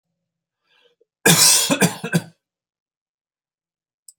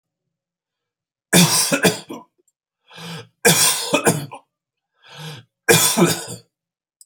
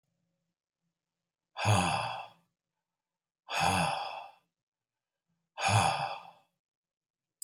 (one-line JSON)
{"cough_length": "4.2 s", "cough_amplitude": 32767, "cough_signal_mean_std_ratio": 0.33, "three_cough_length": "7.1 s", "three_cough_amplitude": 32768, "three_cough_signal_mean_std_ratio": 0.42, "exhalation_length": "7.4 s", "exhalation_amplitude": 7254, "exhalation_signal_mean_std_ratio": 0.39, "survey_phase": "beta (2021-08-13 to 2022-03-07)", "age": "45-64", "gender": "Male", "wearing_mask": "No", "symptom_none": true, "smoker_status": "Ex-smoker", "respiratory_condition_asthma": false, "respiratory_condition_other": false, "recruitment_source": "REACT", "submission_delay": "4 days", "covid_test_result": "Negative", "covid_test_method": "RT-qPCR", "influenza_a_test_result": "Negative", "influenza_b_test_result": "Negative"}